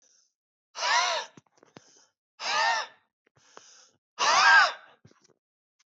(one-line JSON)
{"exhalation_length": "5.9 s", "exhalation_amplitude": 13405, "exhalation_signal_mean_std_ratio": 0.38, "survey_phase": "beta (2021-08-13 to 2022-03-07)", "age": "45-64", "gender": "Male", "wearing_mask": "No", "symptom_cough_any": true, "symptom_fatigue": true, "symptom_headache": true, "smoker_status": "Never smoked", "respiratory_condition_asthma": true, "respiratory_condition_other": false, "recruitment_source": "REACT", "submission_delay": "2 days", "covid_test_result": "Negative", "covid_test_method": "RT-qPCR", "influenza_a_test_result": "Negative", "influenza_b_test_result": "Negative"}